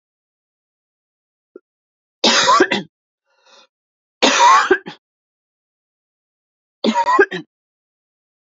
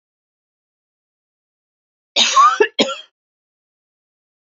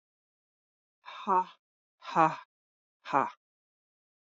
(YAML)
three_cough_length: 8.5 s
three_cough_amplitude: 32767
three_cough_signal_mean_std_ratio: 0.34
cough_length: 4.4 s
cough_amplitude: 28662
cough_signal_mean_std_ratio: 0.28
exhalation_length: 4.4 s
exhalation_amplitude: 10409
exhalation_signal_mean_std_ratio: 0.26
survey_phase: alpha (2021-03-01 to 2021-08-12)
age: 45-64
gender: Female
wearing_mask: 'No'
symptom_cough_any: true
symptom_fatigue: true
symptom_headache: true
symptom_change_to_sense_of_smell_or_taste: true
symptom_loss_of_taste: true
smoker_status: Never smoked
respiratory_condition_asthma: false
respiratory_condition_other: false
recruitment_source: Test and Trace
submission_delay: 2 days
covid_test_result: Positive
covid_test_method: LAMP